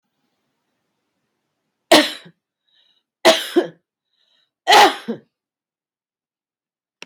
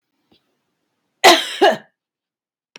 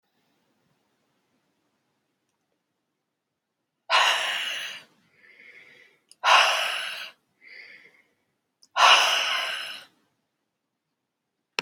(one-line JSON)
{"three_cough_length": "7.1 s", "three_cough_amplitude": 32768, "three_cough_signal_mean_std_ratio": 0.25, "cough_length": "2.8 s", "cough_amplitude": 32768, "cough_signal_mean_std_ratio": 0.28, "exhalation_length": "11.6 s", "exhalation_amplitude": 20726, "exhalation_signal_mean_std_ratio": 0.33, "survey_phase": "beta (2021-08-13 to 2022-03-07)", "age": "65+", "gender": "Female", "wearing_mask": "No", "symptom_none": true, "smoker_status": "Ex-smoker", "respiratory_condition_asthma": false, "respiratory_condition_other": false, "recruitment_source": "REACT", "submission_delay": "7 days", "covid_test_result": "Negative", "covid_test_method": "RT-qPCR"}